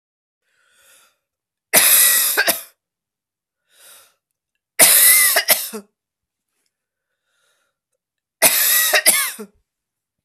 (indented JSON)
{
  "three_cough_length": "10.2 s",
  "three_cough_amplitude": 32768,
  "three_cough_signal_mean_std_ratio": 0.39,
  "survey_phase": "beta (2021-08-13 to 2022-03-07)",
  "age": "45-64",
  "gender": "Female",
  "wearing_mask": "No",
  "symptom_cough_any": true,
  "symptom_runny_or_blocked_nose": true,
  "symptom_sore_throat": true,
  "symptom_fatigue": true,
  "symptom_fever_high_temperature": true,
  "symptom_headache": true,
  "symptom_change_to_sense_of_smell_or_taste": true,
  "smoker_status": "Never smoked",
  "respiratory_condition_asthma": false,
  "respiratory_condition_other": false,
  "recruitment_source": "Test and Trace",
  "submission_delay": "2 days",
  "covid_test_result": "Positive",
  "covid_test_method": "RT-qPCR",
  "covid_ct_value": 27.8,
  "covid_ct_gene": "ORF1ab gene"
}